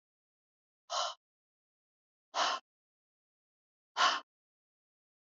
{"exhalation_length": "5.2 s", "exhalation_amplitude": 6034, "exhalation_signal_mean_std_ratio": 0.27, "survey_phase": "alpha (2021-03-01 to 2021-08-12)", "age": "65+", "gender": "Female", "wearing_mask": "No", "symptom_none": true, "smoker_status": "Never smoked", "respiratory_condition_asthma": false, "respiratory_condition_other": false, "recruitment_source": "REACT", "submission_delay": "1 day", "covid_test_result": "Negative", "covid_test_method": "RT-qPCR"}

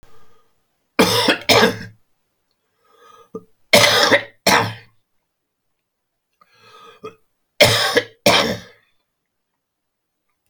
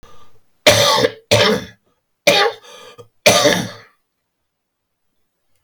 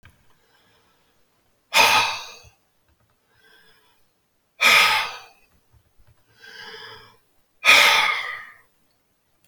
{"three_cough_length": "10.5 s", "three_cough_amplitude": 32768, "three_cough_signal_mean_std_ratio": 0.36, "cough_length": "5.6 s", "cough_amplitude": 32260, "cough_signal_mean_std_ratio": 0.42, "exhalation_length": "9.5 s", "exhalation_amplitude": 30521, "exhalation_signal_mean_std_ratio": 0.33, "survey_phase": "beta (2021-08-13 to 2022-03-07)", "age": "65+", "gender": "Male", "wearing_mask": "No", "symptom_cough_any": true, "symptom_runny_or_blocked_nose": true, "symptom_shortness_of_breath": true, "symptom_abdominal_pain": true, "symptom_fatigue": true, "symptom_fever_high_temperature": true, "symptom_onset": "4 days", "smoker_status": "Never smoked", "respiratory_condition_asthma": false, "respiratory_condition_other": true, "recruitment_source": "Test and Trace", "submission_delay": "1 day", "covid_test_result": "Positive", "covid_test_method": "ePCR"}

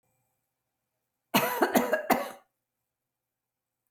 {"cough_length": "3.9 s", "cough_amplitude": 12964, "cough_signal_mean_std_ratio": 0.33, "survey_phase": "alpha (2021-03-01 to 2021-08-12)", "age": "45-64", "gender": "Female", "wearing_mask": "No", "symptom_fatigue": true, "smoker_status": "Never smoked", "respiratory_condition_asthma": false, "respiratory_condition_other": false, "recruitment_source": "REACT", "submission_delay": "2 days", "covid_test_result": "Negative", "covid_test_method": "RT-qPCR"}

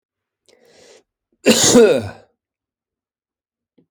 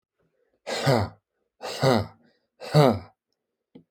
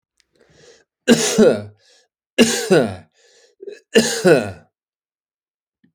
{"cough_length": "3.9 s", "cough_amplitude": 30901, "cough_signal_mean_std_ratio": 0.31, "exhalation_length": "3.9 s", "exhalation_amplitude": 21344, "exhalation_signal_mean_std_ratio": 0.36, "three_cough_length": "5.9 s", "three_cough_amplitude": 32767, "three_cough_signal_mean_std_ratio": 0.39, "survey_phase": "alpha (2021-03-01 to 2021-08-12)", "age": "45-64", "gender": "Male", "wearing_mask": "No", "symptom_none": true, "smoker_status": "Ex-smoker", "respiratory_condition_asthma": false, "respiratory_condition_other": false, "recruitment_source": "REACT", "submission_delay": "2 days", "covid_test_result": "Negative", "covid_test_method": "RT-qPCR"}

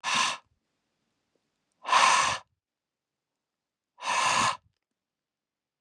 {"exhalation_length": "5.8 s", "exhalation_amplitude": 12505, "exhalation_signal_mean_std_ratio": 0.38, "survey_phase": "beta (2021-08-13 to 2022-03-07)", "age": "18-44", "gender": "Male", "wearing_mask": "No", "symptom_none": true, "smoker_status": "Ex-smoker", "respiratory_condition_asthma": false, "respiratory_condition_other": false, "recruitment_source": "REACT", "submission_delay": "1 day", "covid_test_result": "Negative", "covid_test_method": "RT-qPCR"}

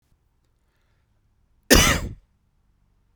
{"cough_length": "3.2 s", "cough_amplitude": 32767, "cough_signal_mean_std_ratio": 0.25, "survey_phase": "beta (2021-08-13 to 2022-03-07)", "age": "45-64", "gender": "Male", "wearing_mask": "No", "symptom_none": true, "smoker_status": "Never smoked", "respiratory_condition_asthma": false, "respiratory_condition_other": false, "recruitment_source": "REACT", "submission_delay": "1 day", "covid_test_result": "Negative", "covid_test_method": "RT-qPCR"}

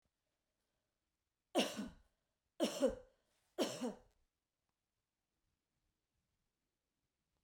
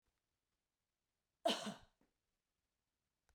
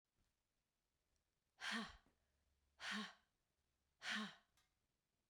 {"three_cough_length": "7.4 s", "three_cough_amplitude": 2778, "three_cough_signal_mean_std_ratio": 0.26, "cough_length": "3.3 s", "cough_amplitude": 2098, "cough_signal_mean_std_ratio": 0.2, "exhalation_length": "5.3 s", "exhalation_amplitude": 667, "exhalation_signal_mean_std_ratio": 0.34, "survey_phase": "beta (2021-08-13 to 2022-03-07)", "age": "45-64", "gender": "Female", "wearing_mask": "No", "symptom_none": true, "smoker_status": "Never smoked", "respiratory_condition_asthma": false, "respiratory_condition_other": false, "recruitment_source": "REACT", "submission_delay": "1 day", "covid_test_result": "Negative", "covid_test_method": "RT-qPCR"}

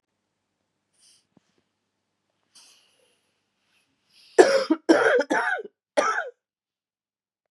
{"three_cough_length": "7.5 s", "three_cough_amplitude": 29169, "three_cough_signal_mean_std_ratio": 0.29, "survey_phase": "beta (2021-08-13 to 2022-03-07)", "age": "45-64", "gender": "Female", "wearing_mask": "No", "symptom_cough_any": true, "symptom_new_continuous_cough": true, "symptom_runny_or_blocked_nose": true, "symptom_sore_throat": true, "symptom_fatigue": true, "symptom_fever_high_temperature": true, "symptom_headache": true, "symptom_change_to_sense_of_smell_or_taste": true, "symptom_onset": "4 days", "smoker_status": "Ex-smoker", "respiratory_condition_asthma": false, "respiratory_condition_other": false, "recruitment_source": "Test and Trace", "submission_delay": "2 days", "covid_test_result": "Positive", "covid_test_method": "RT-qPCR", "covid_ct_value": 18.3, "covid_ct_gene": "N gene", "covid_ct_mean": 19.3, "covid_viral_load": "460000 copies/ml", "covid_viral_load_category": "Low viral load (10K-1M copies/ml)"}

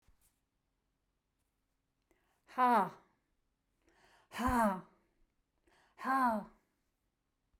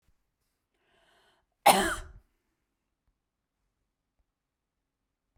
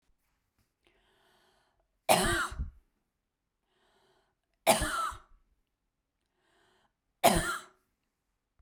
{"exhalation_length": "7.6 s", "exhalation_amplitude": 3800, "exhalation_signal_mean_std_ratio": 0.31, "cough_length": "5.4 s", "cough_amplitude": 15113, "cough_signal_mean_std_ratio": 0.17, "three_cough_length": "8.6 s", "three_cough_amplitude": 13848, "three_cough_signal_mean_std_ratio": 0.28, "survey_phase": "beta (2021-08-13 to 2022-03-07)", "age": "45-64", "gender": "Female", "wearing_mask": "No", "symptom_none": true, "smoker_status": "Never smoked", "respiratory_condition_asthma": false, "respiratory_condition_other": false, "recruitment_source": "REACT", "submission_delay": "1 day", "covid_test_result": "Negative", "covid_test_method": "RT-qPCR", "influenza_a_test_result": "Negative", "influenza_b_test_result": "Negative"}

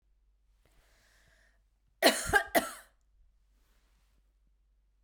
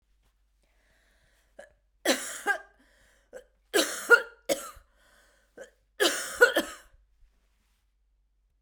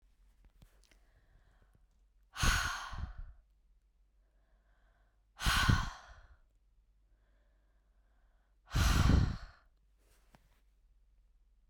{"cough_length": "5.0 s", "cough_amplitude": 12662, "cough_signal_mean_std_ratio": 0.23, "three_cough_length": "8.6 s", "three_cough_amplitude": 18592, "three_cough_signal_mean_std_ratio": 0.27, "exhalation_length": "11.7 s", "exhalation_amplitude": 5694, "exhalation_signal_mean_std_ratio": 0.32, "survey_phase": "beta (2021-08-13 to 2022-03-07)", "age": "18-44", "gender": "Female", "wearing_mask": "No", "symptom_none": true, "symptom_onset": "11 days", "smoker_status": "Never smoked", "respiratory_condition_asthma": false, "respiratory_condition_other": false, "recruitment_source": "REACT", "submission_delay": "1 day", "covid_test_result": "Negative", "covid_test_method": "RT-qPCR", "influenza_a_test_result": "Unknown/Void", "influenza_b_test_result": "Unknown/Void"}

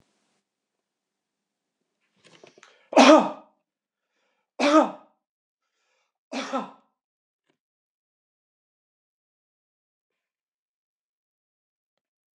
{"three_cough_length": "12.4 s", "three_cough_amplitude": 25567, "three_cough_signal_mean_std_ratio": 0.18, "survey_phase": "beta (2021-08-13 to 2022-03-07)", "age": "65+", "gender": "Male", "wearing_mask": "No", "symptom_none": true, "smoker_status": "Never smoked", "respiratory_condition_asthma": false, "respiratory_condition_other": false, "recruitment_source": "REACT", "submission_delay": "8 days", "covid_test_result": "Negative", "covid_test_method": "RT-qPCR", "influenza_a_test_result": "Negative", "influenza_b_test_result": "Negative"}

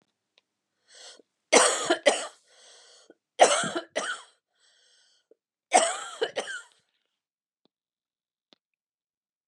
{"cough_length": "9.5 s", "cough_amplitude": 20686, "cough_signal_mean_std_ratio": 0.29, "survey_phase": "beta (2021-08-13 to 2022-03-07)", "age": "65+", "gender": "Female", "wearing_mask": "No", "symptom_none": true, "smoker_status": "Never smoked", "respiratory_condition_asthma": false, "respiratory_condition_other": false, "recruitment_source": "REACT", "submission_delay": "2 days", "covid_test_result": "Negative", "covid_test_method": "RT-qPCR", "influenza_a_test_result": "Negative", "influenza_b_test_result": "Negative"}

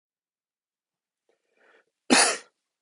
{"cough_length": "2.8 s", "cough_amplitude": 19370, "cough_signal_mean_std_ratio": 0.23, "survey_phase": "beta (2021-08-13 to 2022-03-07)", "age": "45-64", "gender": "Male", "wearing_mask": "No", "symptom_cough_any": true, "symptom_runny_or_blocked_nose": true, "symptom_fatigue": true, "symptom_headache": true, "symptom_change_to_sense_of_smell_or_taste": true, "smoker_status": "Never smoked", "respiratory_condition_asthma": false, "respiratory_condition_other": false, "recruitment_source": "Test and Trace", "submission_delay": "2 days", "covid_test_result": "Positive", "covid_test_method": "RT-qPCR", "covid_ct_value": 26.2, "covid_ct_gene": "ORF1ab gene"}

